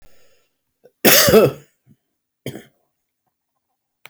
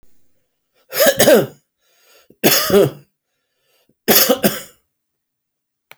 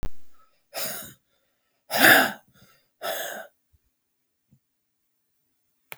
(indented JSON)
{
  "cough_length": "4.1 s",
  "cough_amplitude": 32768,
  "cough_signal_mean_std_ratio": 0.29,
  "three_cough_length": "6.0 s",
  "three_cough_amplitude": 32768,
  "three_cough_signal_mean_std_ratio": 0.38,
  "exhalation_length": "6.0 s",
  "exhalation_amplitude": 26255,
  "exhalation_signal_mean_std_ratio": 0.3,
  "survey_phase": "beta (2021-08-13 to 2022-03-07)",
  "age": "65+",
  "gender": "Male",
  "wearing_mask": "No",
  "symptom_cough_any": true,
  "symptom_onset": "10 days",
  "smoker_status": "Never smoked",
  "respiratory_condition_asthma": false,
  "respiratory_condition_other": false,
  "recruitment_source": "REACT",
  "submission_delay": "33 days",
  "covid_test_result": "Negative",
  "covid_test_method": "RT-qPCR"
}